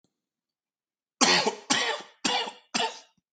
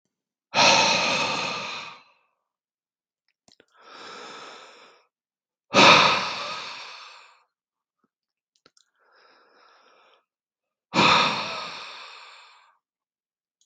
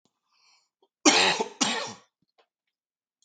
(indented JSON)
{
  "three_cough_length": "3.3 s",
  "three_cough_amplitude": 16417,
  "three_cough_signal_mean_std_ratio": 0.44,
  "exhalation_length": "13.7 s",
  "exhalation_amplitude": 30821,
  "exhalation_signal_mean_std_ratio": 0.34,
  "cough_length": "3.2 s",
  "cough_amplitude": 25406,
  "cough_signal_mean_std_ratio": 0.33,
  "survey_phase": "beta (2021-08-13 to 2022-03-07)",
  "age": "45-64",
  "gender": "Male",
  "wearing_mask": "No",
  "symptom_cough_any": true,
  "symptom_runny_or_blocked_nose": true,
  "symptom_sore_throat": true,
  "symptom_fatigue": true,
  "symptom_headache": true,
  "smoker_status": "Ex-smoker",
  "respiratory_condition_asthma": false,
  "respiratory_condition_other": false,
  "recruitment_source": "Test and Trace",
  "submission_delay": "1 day",
  "covid_test_result": "Positive",
  "covid_test_method": "RT-qPCR",
  "covid_ct_value": 19.6,
  "covid_ct_gene": "ORF1ab gene"
}